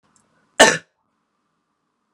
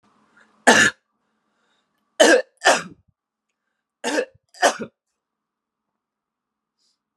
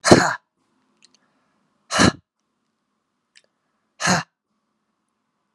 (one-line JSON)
{"cough_length": "2.1 s", "cough_amplitude": 32768, "cough_signal_mean_std_ratio": 0.2, "three_cough_length": "7.2 s", "three_cough_amplitude": 32528, "three_cough_signal_mean_std_ratio": 0.27, "exhalation_length": "5.5 s", "exhalation_amplitude": 32768, "exhalation_signal_mean_std_ratio": 0.24, "survey_phase": "alpha (2021-03-01 to 2021-08-12)", "age": "18-44", "gender": "Male", "wearing_mask": "No", "symptom_cough_any": true, "symptom_fatigue": true, "symptom_fever_high_temperature": true, "symptom_headache": true, "symptom_change_to_sense_of_smell_or_taste": true, "symptom_onset": "3 days", "smoker_status": "Never smoked", "respiratory_condition_asthma": false, "respiratory_condition_other": false, "recruitment_source": "Test and Trace", "submission_delay": "3 days", "covid_test_result": "Positive", "covid_test_method": "RT-qPCR", "covid_ct_value": 12.2, "covid_ct_gene": "ORF1ab gene", "covid_ct_mean": 12.7, "covid_viral_load": "71000000 copies/ml", "covid_viral_load_category": "High viral load (>1M copies/ml)"}